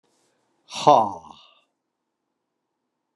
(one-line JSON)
{"exhalation_length": "3.2 s", "exhalation_amplitude": 31798, "exhalation_signal_mean_std_ratio": 0.22, "survey_phase": "beta (2021-08-13 to 2022-03-07)", "age": "65+", "gender": "Male", "wearing_mask": "No", "symptom_cough_any": true, "symptom_onset": "4 days", "smoker_status": "Never smoked", "respiratory_condition_asthma": false, "respiratory_condition_other": false, "recruitment_source": "Test and Trace", "submission_delay": "2 days", "covid_test_result": "Positive", "covid_test_method": "RT-qPCR", "covid_ct_value": 15.3, "covid_ct_gene": "ORF1ab gene", "covid_ct_mean": 15.6, "covid_viral_load": "7600000 copies/ml", "covid_viral_load_category": "High viral load (>1M copies/ml)"}